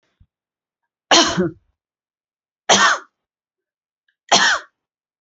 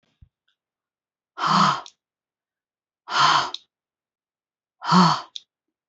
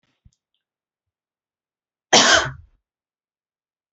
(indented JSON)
{
  "three_cough_length": "5.2 s",
  "three_cough_amplitude": 31067,
  "three_cough_signal_mean_std_ratio": 0.33,
  "exhalation_length": "5.9 s",
  "exhalation_amplitude": 23986,
  "exhalation_signal_mean_std_ratio": 0.34,
  "cough_length": "3.9 s",
  "cough_amplitude": 32187,
  "cough_signal_mean_std_ratio": 0.23,
  "survey_phase": "beta (2021-08-13 to 2022-03-07)",
  "age": "18-44",
  "gender": "Female",
  "wearing_mask": "No",
  "symptom_none": true,
  "smoker_status": "Never smoked",
  "respiratory_condition_asthma": false,
  "respiratory_condition_other": false,
  "recruitment_source": "REACT",
  "submission_delay": "1 day",
  "covid_test_result": "Negative",
  "covid_test_method": "RT-qPCR",
  "influenza_a_test_result": "Unknown/Void",
  "influenza_b_test_result": "Unknown/Void"
}